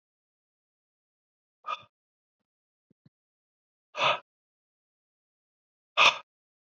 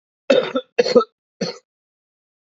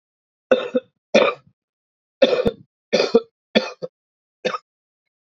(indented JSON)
{
  "exhalation_length": "6.7 s",
  "exhalation_amplitude": 15284,
  "exhalation_signal_mean_std_ratio": 0.18,
  "cough_length": "2.5 s",
  "cough_amplitude": 27908,
  "cough_signal_mean_std_ratio": 0.34,
  "three_cough_length": "5.3 s",
  "three_cough_amplitude": 27833,
  "three_cough_signal_mean_std_ratio": 0.34,
  "survey_phase": "beta (2021-08-13 to 2022-03-07)",
  "age": "18-44",
  "gender": "Male",
  "wearing_mask": "No",
  "symptom_cough_any": true,
  "symptom_fatigue": true,
  "symptom_fever_high_temperature": true,
  "symptom_headache": true,
  "smoker_status": "Never smoked",
  "respiratory_condition_asthma": false,
  "respiratory_condition_other": false,
  "recruitment_source": "Test and Trace",
  "submission_delay": "1 day",
  "covid_test_result": "Positive",
  "covid_test_method": "LFT"
}